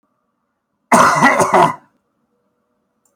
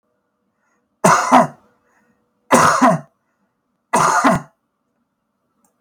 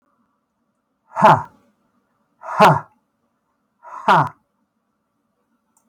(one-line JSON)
{"cough_length": "3.2 s", "cough_amplitude": 32768, "cough_signal_mean_std_ratio": 0.41, "three_cough_length": "5.8 s", "three_cough_amplitude": 32766, "three_cough_signal_mean_std_ratio": 0.39, "exhalation_length": "5.9 s", "exhalation_amplitude": 32768, "exhalation_signal_mean_std_ratio": 0.27, "survey_phase": "beta (2021-08-13 to 2022-03-07)", "age": "65+", "gender": "Male", "wearing_mask": "No", "symptom_none": true, "symptom_onset": "12 days", "smoker_status": "Never smoked", "respiratory_condition_asthma": false, "respiratory_condition_other": false, "recruitment_source": "REACT", "submission_delay": "3 days", "covid_test_result": "Negative", "covid_test_method": "RT-qPCR"}